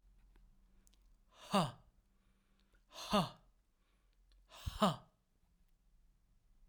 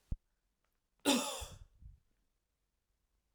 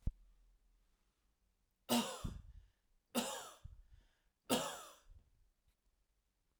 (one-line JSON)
{"exhalation_length": "6.7 s", "exhalation_amplitude": 3813, "exhalation_signal_mean_std_ratio": 0.27, "cough_length": "3.3 s", "cough_amplitude": 5405, "cough_signal_mean_std_ratio": 0.27, "three_cough_length": "6.6 s", "three_cough_amplitude": 3149, "three_cough_signal_mean_std_ratio": 0.33, "survey_phase": "alpha (2021-03-01 to 2021-08-12)", "age": "45-64", "gender": "Male", "wearing_mask": "No", "symptom_none": true, "smoker_status": "Never smoked", "respiratory_condition_asthma": false, "respiratory_condition_other": false, "recruitment_source": "REACT", "submission_delay": "3 days", "covid_test_result": "Negative", "covid_test_method": "RT-qPCR"}